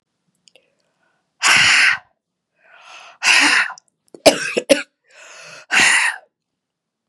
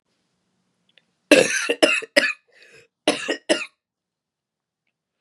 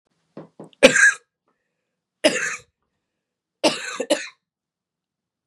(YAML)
exhalation_length: 7.1 s
exhalation_amplitude: 32768
exhalation_signal_mean_std_ratio: 0.41
cough_length: 5.2 s
cough_amplitude: 32767
cough_signal_mean_std_ratio: 0.31
three_cough_length: 5.5 s
three_cough_amplitude: 32768
three_cough_signal_mean_std_ratio: 0.28
survey_phase: beta (2021-08-13 to 2022-03-07)
age: 18-44
gender: Female
wearing_mask: 'No'
symptom_cough_any: true
symptom_new_continuous_cough: true
symptom_runny_or_blocked_nose: true
symptom_sore_throat: true
symptom_fatigue: true
symptom_fever_high_temperature: true
symptom_headache: true
symptom_onset: 3 days
smoker_status: Never smoked
respiratory_condition_asthma: false
respiratory_condition_other: false
recruitment_source: Test and Trace
submission_delay: 1 day
covid_test_result: Positive
covid_test_method: RT-qPCR
covid_ct_value: 19.7
covid_ct_gene: ORF1ab gene
covid_ct_mean: 20.2
covid_viral_load: 240000 copies/ml
covid_viral_load_category: Low viral load (10K-1M copies/ml)